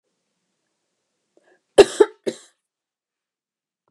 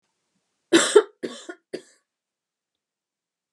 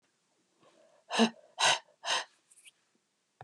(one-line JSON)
{"cough_length": "3.9 s", "cough_amplitude": 32768, "cough_signal_mean_std_ratio": 0.15, "three_cough_length": "3.5 s", "three_cough_amplitude": 28177, "three_cough_signal_mean_std_ratio": 0.22, "exhalation_length": "3.4 s", "exhalation_amplitude": 7830, "exhalation_signal_mean_std_ratio": 0.31, "survey_phase": "beta (2021-08-13 to 2022-03-07)", "age": "45-64", "gender": "Female", "wearing_mask": "No", "symptom_none": true, "smoker_status": "Never smoked", "respiratory_condition_asthma": false, "respiratory_condition_other": false, "recruitment_source": "REACT", "submission_delay": "2 days", "covid_test_result": "Negative", "covid_test_method": "RT-qPCR", "influenza_a_test_result": "Unknown/Void", "influenza_b_test_result": "Unknown/Void"}